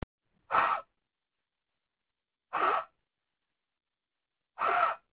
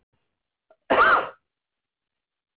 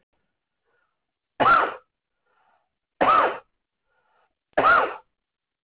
{"exhalation_length": "5.1 s", "exhalation_amplitude": 6893, "exhalation_signal_mean_std_ratio": 0.35, "cough_length": "2.6 s", "cough_amplitude": 13483, "cough_signal_mean_std_ratio": 0.31, "three_cough_length": "5.6 s", "three_cough_amplitude": 16395, "three_cough_signal_mean_std_ratio": 0.34, "survey_phase": "alpha (2021-03-01 to 2021-08-12)", "age": "45-64", "gender": "Male", "wearing_mask": "No", "symptom_none": true, "symptom_onset": "12 days", "smoker_status": "Never smoked", "respiratory_condition_asthma": false, "respiratory_condition_other": false, "recruitment_source": "REACT", "submission_delay": "1 day", "covid_test_result": "Negative", "covid_test_method": "RT-qPCR"}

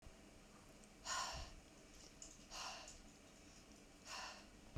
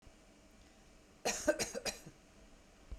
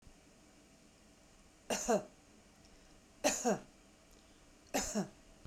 {"exhalation_length": "4.8 s", "exhalation_amplitude": 802, "exhalation_signal_mean_std_ratio": 0.68, "cough_length": "3.0 s", "cough_amplitude": 3985, "cough_signal_mean_std_ratio": 0.39, "three_cough_length": "5.5 s", "three_cough_amplitude": 4342, "three_cough_signal_mean_std_ratio": 0.38, "survey_phase": "beta (2021-08-13 to 2022-03-07)", "age": "45-64", "gender": "Female", "wearing_mask": "No", "symptom_none": true, "smoker_status": "Never smoked", "respiratory_condition_asthma": false, "respiratory_condition_other": false, "recruitment_source": "REACT", "submission_delay": "2 days", "covid_test_result": "Negative", "covid_test_method": "RT-qPCR"}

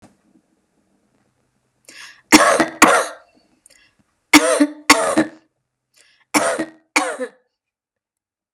{"three_cough_length": "8.5 s", "three_cough_amplitude": 32768, "three_cough_signal_mean_std_ratio": 0.34, "survey_phase": "beta (2021-08-13 to 2022-03-07)", "age": "45-64", "gender": "Female", "wearing_mask": "No", "symptom_runny_or_blocked_nose": true, "symptom_headache": true, "smoker_status": "Never smoked", "respiratory_condition_asthma": false, "respiratory_condition_other": false, "recruitment_source": "REACT", "submission_delay": "1 day", "covid_test_result": "Negative", "covid_test_method": "RT-qPCR", "influenza_a_test_result": "Negative", "influenza_b_test_result": "Negative"}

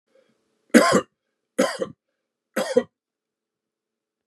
{"three_cough_length": "4.3 s", "three_cough_amplitude": 32653, "three_cough_signal_mean_std_ratio": 0.28, "survey_phase": "beta (2021-08-13 to 2022-03-07)", "age": "45-64", "gender": "Male", "wearing_mask": "No", "symptom_none": true, "smoker_status": "Never smoked", "respiratory_condition_asthma": false, "respiratory_condition_other": false, "recruitment_source": "REACT", "submission_delay": "1 day", "covid_test_result": "Negative", "covid_test_method": "RT-qPCR", "influenza_a_test_result": "Negative", "influenza_b_test_result": "Negative"}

